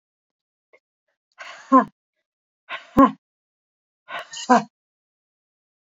{
  "exhalation_length": "5.9 s",
  "exhalation_amplitude": 26753,
  "exhalation_signal_mean_std_ratio": 0.22,
  "survey_phase": "beta (2021-08-13 to 2022-03-07)",
  "age": "45-64",
  "gender": "Female",
  "wearing_mask": "No",
  "symptom_cough_any": true,
  "symptom_runny_or_blocked_nose": true,
  "symptom_fever_high_temperature": true,
  "symptom_other": true,
  "symptom_onset": "3 days",
  "smoker_status": "Never smoked",
  "respiratory_condition_asthma": false,
  "respiratory_condition_other": false,
  "recruitment_source": "Test and Trace",
  "submission_delay": "1 day",
  "covid_test_result": "Positive",
  "covid_test_method": "ePCR"
}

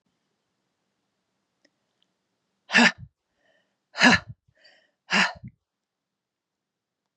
{
  "exhalation_length": "7.2 s",
  "exhalation_amplitude": 24137,
  "exhalation_signal_mean_std_ratio": 0.22,
  "survey_phase": "beta (2021-08-13 to 2022-03-07)",
  "age": "45-64",
  "gender": "Female",
  "wearing_mask": "No",
  "symptom_runny_or_blocked_nose": true,
  "smoker_status": "Never smoked",
  "respiratory_condition_asthma": false,
  "respiratory_condition_other": false,
  "recruitment_source": "Test and Trace",
  "submission_delay": "2 days",
  "covid_test_result": "Positive",
  "covid_test_method": "RT-qPCR",
  "covid_ct_value": 22.7,
  "covid_ct_gene": "ORF1ab gene",
  "covid_ct_mean": 23.5,
  "covid_viral_load": "20000 copies/ml",
  "covid_viral_load_category": "Low viral load (10K-1M copies/ml)"
}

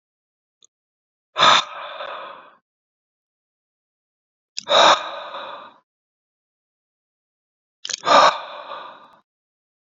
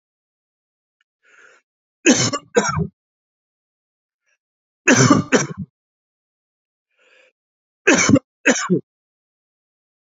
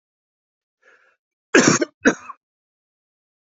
{
  "exhalation_length": "10.0 s",
  "exhalation_amplitude": 28855,
  "exhalation_signal_mean_std_ratio": 0.28,
  "three_cough_length": "10.2 s",
  "three_cough_amplitude": 29806,
  "three_cough_signal_mean_std_ratio": 0.31,
  "cough_length": "3.4 s",
  "cough_amplitude": 32645,
  "cough_signal_mean_std_ratio": 0.25,
  "survey_phase": "beta (2021-08-13 to 2022-03-07)",
  "age": "18-44",
  "gender": "Male",
  "wearing_mask": "No",
  "symptom_cough_any": true,
  "symptom_runny_or_blocked_nose": true,
  "symptom_shortness_of_breath": true,
  "symptom_fatigue": true,
  "symptom_headache": true,
  "symptom_change_to_sense_of_smell_or_taste": true,
  "symptom_loss_of_taste": true,
  "symptom_onset": "3 days",
  "smoker_status": "Never smoked",
  "respiratory_condition_asthma": false,
  "respiratory_condition_other": false,
  "recruitment_source": "Test and Trace",
  "submission_delay": "2 days",
  "covid_test_result": "Positive",
  "covid_test_method": "RT-qPCR",
  "covid_ct_value": 15.1,
  "covid_ct_gene": "ORF1ab gene",
  "covid_ct_mean": 16.2,
  "covid_viral_load": "4800000 copies/ml",
  "covid_viral_load_category": "High viral load (>1M copies/ml)"
}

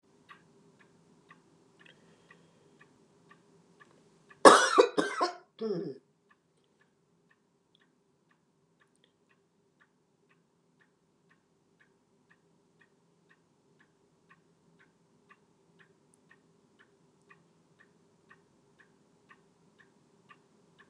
{
  "cough_length": "20.9 s",
  "cough_amplitude": 31257,
  "cough_signal_mean_std_ratio": 0.14,
  "survey_phase": "beta (2021-08-13 to 2022-03-07)",
  "age": "65+",
  "gender": "Female",
  "wearing_mask": "No",
  "symptom_none": true,
  "smoker_status": "Never smoked",
  "respiratory_condition_asthma": false,
  "respiratory_condition_other": false,
  "recruitment_source": "REACT",
  "submission_delay": "2 days",
  "covid_test_result": "Negative",
  "covid_test_method": "RT-qPCR",
  "influenza_a_test_result": "Negative",
  "influenza_b_test_result": "Negative"
}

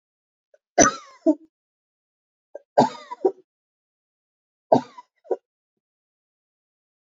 {
  "three_cough_length": "7.2 s",
  "three_cough_amplitude": 26731,
  "three_cough_signal_mean_std_ratio": 0.21,
  "survey_phase": "beta (2021-08-13 to 2022-03-07)",
  "age": "45-64",
  "gender": "Female",
  "wearing_mask": "No",
  "symptom_new_continuous_cough": true,
  "symptom_runny_or_blocked_nose": true,
  "symptom_shortness_of_breath": true,
  "symptom_sore_throat": true,
  "symptom_fatigue": true,
  "symptom_headache": true,
  "smoker_status": "Never smoked",
  "respiratory_condition_asthma": false,
  "respiratory_condition_other": false,
  "recruitment_source": "Test and Trace",
  "submission_delay": "0 days",
  "covid_test_result": "Positive",
  "covid_test_method": "RT-qPCR",
  "covid_ct_value": 22.6,
  "covid_ct_gene": "N gene"
}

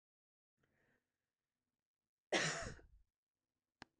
{
  "cough_length": "4.0 s",
  "cough_amplitude": 2773,
  "cough_signal_mean_std_ratio": 0.24,
  "survey_phase": "beta (2021-08-13 to 2022-03-07)",
  "age": "45-64",
  "gender": "Female",
  "wearing_mask": "No",
  "symptom_none": true,
  "symptom_onset": "5 days",
  "smoker_status": "Never smoked",
  "respiratory_condition_asthma": false,
  "respiratory_condition_other": false,
  "recruitment_source": "REACT",
  "submission_delay": "1 day",
  "covid_test_result": "Negative",
  "covid_test_method": "RT-qPCR",
  "influenza_a_test_result": "Unknown/Void",
  "influenza_b_test_result": "Unknown/Void"
}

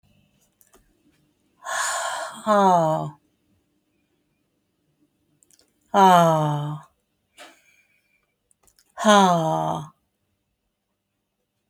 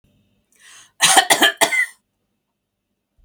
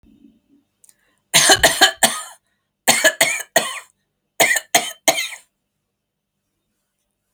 {
  "exhalation_length": "11.7 s",
  "exhalation_amplitude": 26408,
  "exhalation_signal_mean_std_ratio": 0.36,
  "cough_length": "3.2 s",
  "cough_amplitude": 32768,
  "cough_signal_mean_std_ratio": 0.35,
  "three_cough_length": "7.3 s",
  "three_cough_amplitude": 32768,
  "three_cough_signal_mean_std_ratio": 0.36,
  "survey_phase": "beta (2021-08-13 to 2022-03-07)",
  "age": "65+",
  "gender": "Female",
  "wearing_mask": "No",
  "symptom_none": true,
  "smoker_status": "Never smoked",
  "respiratory_condition_asthma": false,
  "respiratory_condition_other": false,
  "recruitment_source": "REACT",
  "submission_delay": "1 day",
  "covid_test_result": "Negative",
  "covid_test_method": "RT-qPCR"
}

